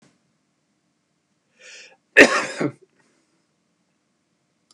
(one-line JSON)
{"cough_length": "4.7 s", "cough_amplitude": 32768, "cough_signal_mean_std_ratio": 0.19, "survey_phase": "beta (2021-08-13 to 2022-03-07)", "age": "65+", "gender": "Male", "wearing_mask": "No", "symptom_cough_any": true, "smoker_status": "Ex-smoker", "respiratory_condition_asthma": false, "respiratory_condition_other": false, "recruitment_source": "REACT", "submission_delay": "2 days", "covid_test_result": "Negative", "covid_test_method": "RT-qPCR", "influenza_a_test_result": "Negative", "influenza_b_test_result": "Negative"}